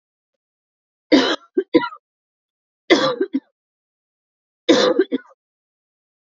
three_cough_length: 6.3 s
three_cough_amplitude: 30544
three_cough_signal_mean_std_ratio: 0.33
survey_phase: beta (2021-08-13 to 2022-03-07)
age: 18-44
gender: Female
wearing_mask: 'No'
symptom_none: true
smoker_status: Never smoked
respiratory_condition_asthma: false
respiratory_condition_other: false
recruitment_source: REACT
submission_delay: 3 days
covid_test_result: Negative
covid_test_method: RT-qPCR
influenza_a_test_result: Negative
influenza_b_test_result: Negative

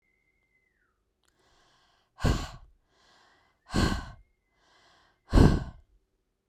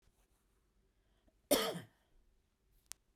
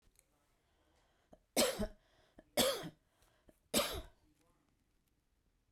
exhalation_length: 6.5 s
exhalation_amplitude: 17717
exhalation_signal_mean_std_ratio: 0.26
cough_length: 3.2 s
cough_amplitude: 5097
cough_signal_mean_std_ratio: 0.23
three_cough_length: 5.7 s
three_cough_amplitude: 4741
three_cough_signal_mean_std_ratio: 0.3
survey_phase: beta (2021-08-13 to 2022-03-07)
age: 45-64
gender: Female
wearing_mask: 'No'
symptom_cough_any: true
symptom_shortness_of_breath: true
symptom_change_to_sense_of_smell_or_taste: true
smoker_status: Ex-smoker
respiratory_condition_asthma: false
respiratory_condition_other: false
recruitment_source: Test and Trace
submission_delay: 1 day
covid_test_result: Positive
covid_test_method: RT-qPCR
covid_ct_value: 38.4
covid_ct_gene: N gene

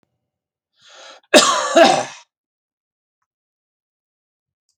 cough_length: 4.8 s
cough_amplitude: 32768
cough_signal_mean_std_ratio: 0.28
survey_phase: beta (2021-08-13 to 2022-03-07)
age: 65+
gender: Male
wearing_mask: 'No'
symptom_none: true
smoker_status: Never smoked
respiratory_condition_asthma: false
respiratory_condition_other: false
recruitment_source: REACT
submission_delay: 0 days
covid_test_result: Negative
covid_test_method: RT-qPCR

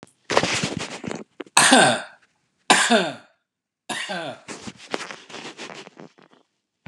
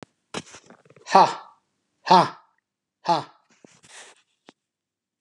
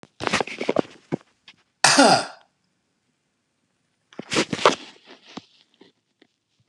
three_cough_length: 6.9 s
three_cough_amplitude: 32768
three_cough_signal_mean_std_ratio: 0.4
exhalation_length: 5.2 s
exhalation_amplitude: 30801
exhalation_signal_mean_std_ratio: 0.25
cough_length: 6.7 s
cough_amplitude: 32552
cough_signal_mean_std_ratio: 0.3
survey_phase: beta (2021-08-13 to 2022-03-07)
age: 65+
gender: Male
wearing_mask: 'No'
symptom_none: true
smoker_status: Ex-smoker
respiratory_condition_asthma: false
respiratory_condition_other: false
recruitment_source: REACT
submission_delay: 3 days
covid_test_result: Negative
covid_test_method: RT-qPCR
influenza_a_test_result: Negative
influenza_b_test_result: Negative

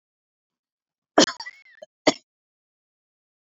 cough_length: 3.6 s
cough_amplitude: 27265
cough_signal_mean_std_ratio: 0.16
survey_phase: beta (2021-08-13 to 2022-03-07)
age: 65+
gender: Female
wearing_mask: 'No'
symptom_none: true
smoker_status: Never smoked
respiratory_condition_asthma: false
respiratory_condition_other: false
recruitment_source: REACT
submission_delay: 3 days
covid_test_result: Negative
covid_test_method: RT-qPCR
influenza_a_test_result: Negative
influenza_b_test_result: Negative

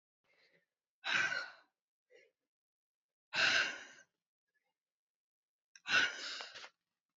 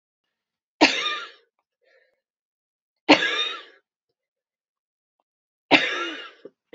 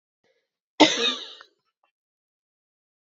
exhalation_length: 7.2 s
exhalation_amplitude: 3779
exhalation_signal_mean_std_ratio: 0.33
three_cough_length: 6.7 s
three_cough_amplitude: 29229
three_cough_signal_mean_std_ratio: 0.28
cough_length: 3.1 s
cough_amplitude: 27171
cough_signal_mean_std_ratio: 0.23
survey_phase: beta (2021-08-13 to 2022-03-07)
age: 18-44
gender: Female
wearing_mask: 'No'
symptom_cough_any: true
symptom_runny_or_blocked_nose: true
symptom_sore_throat: true
symptom_fatigue: true
symptom_onset: 3 days
smoker_status: Never smoked
respiratory_condition_asthma: false
respiratory_condition_other: false
recruitment_source: Test and Trace
submission_delay: 2 days
covid_test_result: Positive
covid_test_method: RT-qPCR
covid_ct_value: 33.5
covid_ct_gene: ORF1ab gene
covid_ct_mean: 33.8
covid_viral_load: 8.5 copies/ml
covid_viral_load_category: Minimal viral load (< 10K copies/ml)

